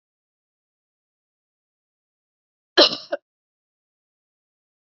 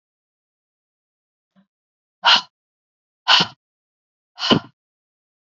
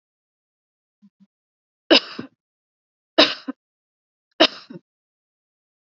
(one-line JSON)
{"cough_length": "4.9 s", "cough_amplitude": 29920, "cough_signal_mean_std_ratio": 0.14, "exhalation_length": "5.5 s", "exhalation_amplitude": 32768, "exhalation_signal_mean_std_ratio": 0.23, "three_cough_length": "6.0 s", "three_cough_amplitude": 32767, "three_cough_signal_mean_std_ratio": 0.18, "survey_phase": "beta (2021-08-13 to 2022-03-07)", "age": "45-64", "gender": "Female", "wearing_mask": "No", "symptom_runny_or_blocked_nose": true, "symptom_sore_throat": true, "symptom_fatigue": true, "symptom_fever_high_temperature": true, "symptom_headache": true, "symptom_change_to_sense_of_smell_or_taste": true, "symptom_loss_of_taste": true, "symptom_other": true, "symptom_onset": "3 days", "smoker_status": "Ex-smoker", "respiratory_condition_asthma": false, "respiratory_condition_other": false, "recruitment_source": "Test and Trace", "submission_delay": "2 days", "covid_test_result": "Positive", "covid_test_method": "RT-qPCR"}